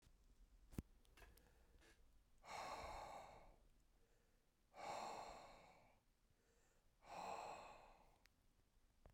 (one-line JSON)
{"exhalation_length": "9.1 s", "exhalation_amplitude": 723, "exhalation_signal_mean_std_ratio": 0.57, "survey_phase": "beta (2021-08-13 to 2022-03-07)", "age": "45-64", "gender": "Male", "wearing_mask": "No", "symptom_runny_or_blocked_nose": true, "symptom_fatigue": true, "symptom_change_to_sense_of_smell_or_taste": true, "smoker_status": "Never smoked", "respiratory_condition_asthma": false, "respiratory_condition_other": false, "recruitment_source": "Test and Trace", "submission_delay": "2 days", "covid_test_result": "Positive", "covid_test_method": "RT-qPCR", "covid_ct_value": 17.7, "covid_ct_gene": "ORF1ab gene", "covid_ct_mean": 18.3, "covid_viral_load": "1000000 copies/ml", "covid_viral_load_category": "High viral load (>1M copies/ml)"}